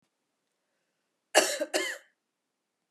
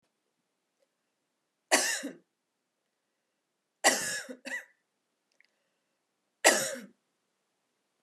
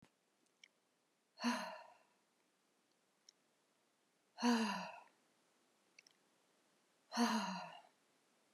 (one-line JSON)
{"cough_length": "2.9 s", "cough_amplitude": 16795, "cough_signal_mean_std_ratio": 0.28, "three_cough_length": "8.0 s", "three_cough_amplitude": 18892, "three_cough_signal_mean_std_ratio": 0.26, "exhalation_length": "8.5 s", "exhalation_amplitude": 2118, "exhalation_signal_mean_std_ratio": 0.32, "survey_phase": "beta (2021-08-13 to 2022-03-07)", "age": "45-64", "gender": "Female", "wearing_mask": "No", "symptom_cough_any": true, "symptom_new_continuous_cough": true, "symptom_runny_or_blocked_nose": true, "symptom_sore_throat": true, "symptom_fatigue": true, "symptom_headache": true, "symptom_change_to_sense_of_smell_or_taste": true, "symptom_onset": "3 days", "smoker_status": "Never smoked", "respiratory_condition_asthma": false, "respiratory_condition_other": false, "recruitment_source": "Test and Trace", "submission_delay": "1 day", "covid_test_result": "Positive", "covid_test_method": "RT-qPCR", "covid_ct_value": 15.4, "covid_ct_gene": "S gene", "covid_ct_mean": 16.3, "covid_viral_load": "4400000 copies/ml", "covid_viral_load_category": "High viral load (>1M copies/ml)"}